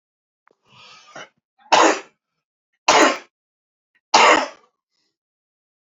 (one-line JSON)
{"three_cough_length": "5.9 s", "three_cough_amplitude": 30202, "three_cough_signal_mean_std_ratio": 0.31, "survey_phase": "alpha (2021-03-01 to 2021-08-12)", "age": "45-64", "gender": "Male", "wearing_mask": "No", "symptom_cough_any": true, "smoker_status": "Never smoked", "respiratory_condition_asthma": false, "respiratory_condition_other": false, "recruitment_source": "Test and Trace", "submission_delay": "1 day", "covid_test_result": "Positive", "covid_test_method": "RT-qPCR", "covid_ct_value": 16.3, "covid_ct_gene": "ORF1ab gene", "covid_ct_mean": 16.5, "covid_viral_load": "3900000 copies/ml", "covid_viral_load_category": "High viral load (>1M copies/ml)"}